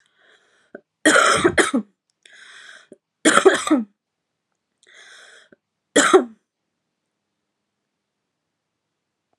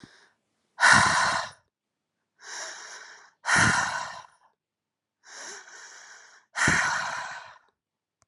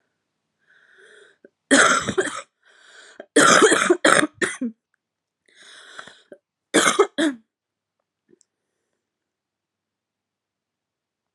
three_cough_length: 9.4 s
three_cough_amplitude: 32768
three_cough_signal_mean_std_ratio: 0.3
exhalation_length: 8.3 s
exhalation_amplitude: 21682
exhalation_signal_mean_std_ratio: 0.41
cough_length: 11.3 s
cough_amplitude: 32767
cough_signal_mean_std_ratio: 0.32
survey_phase: alpha (2021-03-01 to 2021-08-12)
age: 18-44
gender: Female
wearing_mask: 'No'
symptom_cough_any: true
symptom_new_continuous_cough: true
symptom_diarrhoea: true
symptom_fatigue: true
symptom_headache: true
symptom_onset: 3 days
smoker_status: Current smoker (e-cigarettes or vapes only)
respiratory_condition_asthma: false
respiratory_condition_other: false
recruitment_source: Test and Trace
submission_delay: 1 day
covid_test_result: Positive
covid_test_method: RT-qPCR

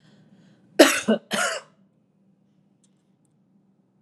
cough_length: 4.0 s
cough_amplitude: 32767
cough_signal_mean_std_ratio: 0.25
survey_phase: alpha (2021-03-01 to 2021-08-12)
age: 45-64
gender: Female
wearing_mask: 'No'
symptom_none: true
smoker_status: Ex-smoker
respiratory_condition_asthma: false
respiratory_condition_other: false
recruitment_source: Test and Trace
submission_delay: 0 days
covid_test_result: Negative
covid_test_method: LFT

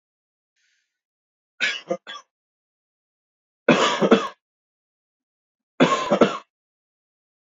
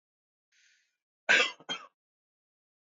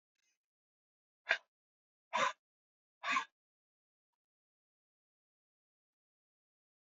three_cough_length: 7.6 s
three_cough_amplitude: 31142
three_cough_signal_mean_std_ratio: 0.29
cough_length: 3.0 s
cough_amplitude: 8868
cough_signal_mean_std_ratio: 0.23
exhalation_length: 6.8 s
exhalation_amplitude: 5375
exhalation_signal_mean_std_ratio: 0.19
survey_phase: beta (2021-08-13 to 2022-03-07)
age: 18-44
gender: Male
wearing_mask: 'No'
symptom_none: true
smoker_status: Never smoked
respiratory_condition_asthma: false
respiratory_condition_other: false
recruitment_source: REACT
submission_delay: 2 days
covid_test_result: Negative
covid_test_method: RT-qPCR
influenza_a_test_result: Negative
influenza_b_test_result: Negative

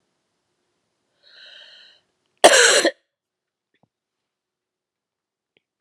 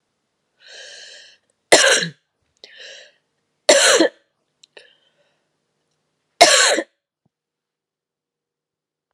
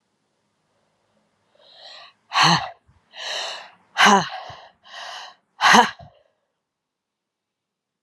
cough_length: 5.8 s
cough_amplitude: 32768
cough_signal_mean_std_ratio: 0.22
three_cough_length: 9.1 s
three_cough_amplitude: 32768
three_cough_signal_mean_std_ratio: 0.28
exhalation_length: 8.0 s
exhalation_amplitude: 32742
exhalation_signal_mean_std_ratio: 0.3
survey_phase: alpha (2021-03-01 to 2021-08-12)
age: 45-64
gender: Female
wearing_mask: 'No'
symptom_cough_any: true
symptom_shortness_of_breath: true
symptom_fatigue: true
symptom_headache: true
symptom_change_to_sense_of_smell_or_taste: true
symptom_onset: 4 days
smoker_status: Never smoked
respiratory_condition_asthma: false
respiratory_condition_other: false
recruitment_source: Test and Trace
submission_delay: 1 day
covid_test_result: Positive
covid_test_method: RT-qPCR
covid_ct_value: 23.9
covid_ct_gene: N gene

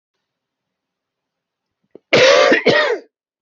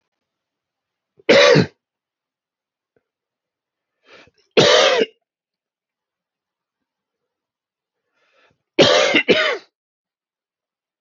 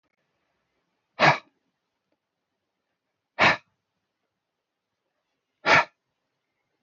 cough_length: 3.4 s
cough_amplitude: 29843
cough_signal_mean_std_ratio: 0.41
three_cough_length: 11.0 s
three_cough_amplitude: 28919
three_cough_signal_mean_std_ratio: 0.3
exhalation_length: 6.8 s
exhalation_amplitude: 17898
exhalation_signal_mean_std_ratio: 0.21
survey_phase: beta (2021-08-13 to 2022-03-07)
age: 18-44
gender: Male
wearing_mask: 'No'
symptom_fatigue: true
symptom_onset: 13 days
smoker_status: Ex-smoker
respiratory_condition_asthma: false
respiratory_condition_other: false
recruitment_source: REACT
submission_delay: 0 days
covid_test_result: Negative
covid_test_method: RT-qPCR
influenza_a_test_result: Negative
influenza_b_test_result: Negative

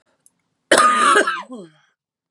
cough_length: 2.3 s
cough_amplitude: 32768
cough_signal_mean_std_ratio: 0.47
survey_phase: beta (2021-08-13 to 2022-03-07)
age: 18-44
gender: Female
wearing_mask: 'No'
symptom_cough_any: true
symptom_runny_or_blocked_nose: true
symptom_sore_throat: true
symptom_fatigue: true
symptom_headache: true
smoker_status: Current smoker (11 or more cigarettes per day)
respiratory_condition_asthma: false
respiratory_condition_other: false
recruitment_source: Test and Trace
submission_delay: 1 day
covid_test_result: Positive
covid_test_method: LFT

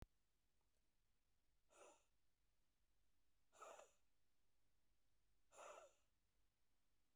exhalation_length: 7.2 s
exhalation_amplitude: 172
exhalation_signal_mean_std_ratio: 0.59
survey_phase: beta (2021-08-13 to 2022-03-07)
age: 45-64
gender: Female
wearing_mask: 'No'
symptom_none: true
smoker_status: Current smoker (1 to 10 cigarettes per day)
respiratory_condition_asthma: false
respiratory_condition_other: false
recruitment_source: REACT
submission_delay: 2 days
covid_test_result: Negative
covid_test_method: RT-qPCR
influenza_a_test_result: Negative
influenza_b_test_result: Negative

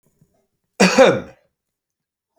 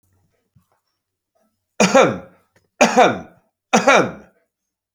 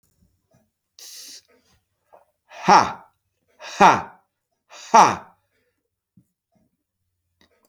cough_length: 2.4 s
cough_amplitude: 29175
cough_signal_mean_std_ratio: 0.31
three_cough_length: 4.9 s
three_cough_amplitude: 30833
three_cough_signal_mean_std_ratio: 0.36
exhalation_length: 7.7 s
exhalation_amplitude: 30295
exhalation_signal_mean_std_ratio: 0.23
survey_phase: beta (2021-08-13 to 2022-03-07)
age: 65+
gender: Male
wearing_mask: 'No'
symptom_none: true
symptom_onset: 8 days
smoker_status: Ex-smoker
respiratory_condition_asthma: false
respiratory_condition_other: false
recruitment_source: REACT
submission_delay: 13 days
covid_test_result: Negative
covid_test_method: RT-qPCR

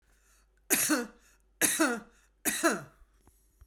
three_cough_length: 3.7 s
three_cough_amplitude: 11574
three_cough_signal_mean_std_ratio: 0.44
survey_phase: beta (2021-08-13 to 2022-03-07)
age: 45-64
gender: Female
wearing_mask: 'No'
symptom_none: true
smoker_status: Current smoker (1 to 10 cigarettes per day)
respiratory_condition_asthma: false
respiratory_condition_other: false
recruitment_source: REACT
submission_delay: 3 days
covid_test_result: Negative
covid_test_method: RT-qPCR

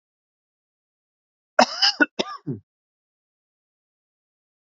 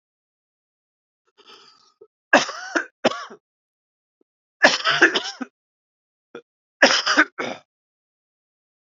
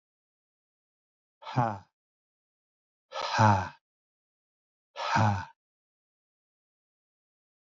cough_length: 4.7 s
cough_amplitude: 27296
cough_signal_mean_std_ratio: 0.21
three_cough_length: 8.9 s
three_cough_amplitude: 29855
three_cough_signal_mean_std_ratio: 0.29
exhalation_length: 7.7 s
exhalation_amplitude: 9311
exhalation_signal_mean_std_ratio: 0.29
survey_phase: beta (2021-08-13 to 2022-03-07)
age: 45-64
gender: Male
wearing_mask: 'No'
symptom_fatigue: true
symptom_onset: 4 days
smoker_status: Never smoked
respiratory_condition_asthma: false
respiratory_condition_other: false
recruitment_source: Test and Trace
submission_delay: 1 day
covid_test_result: Positive
covid_test_method: RT-qPCR
covid_ct_value: 19.3
covid_ct_gene: N gene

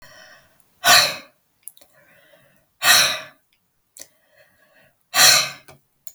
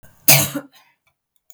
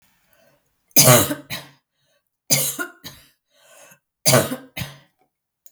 exhalation_length: 6.1 s
exhalation_amplitude: 32768
exhalation_signal_mean_std_ratio: 0.32
cough_length: 1.5 s
cough_amplitude: 32768
cough_signal_mean_std_ratio: 0.31
three_cough_length: 5.7 s
three_cough_amplitude: 32768
three_cough_signal_mean_std_ratio: 0.32
survey_phase: beta (2021-08-13 to 2022-03-07)
age: 45-64
gender: Female
wearing_mask: 'No'
symptom_none: true
smoker_status: Never smoked
respiratory_condition_asthma: false
respiratory_condition_other: false
recruitment_source: REACT
submission_delay: 2 days
covid_test_result: Negative
covid_test_method: RT-qPCR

